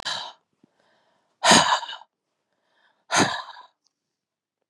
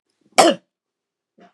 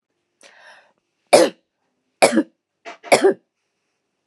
{"exhalation_length": "4.7 s", "exhalation_amplitude": 28000, "exhalation_signal_mean_std_ratio": 0.31, "cough_length": "1.5 s", "cough_amplitude": 32599, "cough_signal_mean_std_ratio": 0.25, "three_cough_length": "4.3 s", "three_cough_amplitude": 32768, "three_cough_signal_mean_std_ratio": 0.28, "survey_phase": "beta (2021-08-13 to 2022-03-07)", "age": "45-64", "gender": "Female", "wearing_mask": "No", "symptom_none": true, "smoker_status": "Ex-smoker", "respiratory_condition_asthma": true, "respiratory_condition_other": false, "recruitment_source": "REACT", "submission_delay": "4 days", "covid_test_result": "Negative", "covid_test_method": "RT-qPCR", "covid_ct_value": 43.0, "covid_ct_gene": "E gene"}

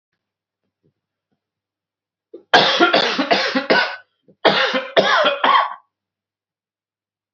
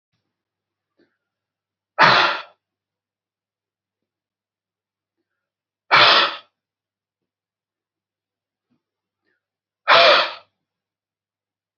{"cough_length": "7.3 s", "cough_amplitude": 32768, "cough_signal_mean_std_ratio": 0.45, "exhalation_length": "11.8 s", "exhalation_amplitude": 30284, "exhalation_signal_mean_std_ratio": 0.25, "survey_phase": "beta (2021-08-13 to 2022-03-07)", "age": "18-44", "gender": "Male", "wearing_mask": "No", "symptom_new_continuous_cough": true, "symptom_sore_throat": true, "symptom_headache": true, "symptom_onset": "6 days", "smoker_status": "Never smoked", "respiratory_condition_asthma": false, "respiratory_condition_other": false, "recruitment_source": "Test and Trace", "submission_delay": "3 days", "covid_test_result": "Positive", "covid_test_method": "RT-qPCR", "covid_ct_value": 14.6, "covid_ct_gene": "ORF1ab gene", "covid_ct_mean": 14.9, "covid_viral_load": "13000000 copies/ml", "covid_viral_load_category": "High viral load (>1M copies/ml)"}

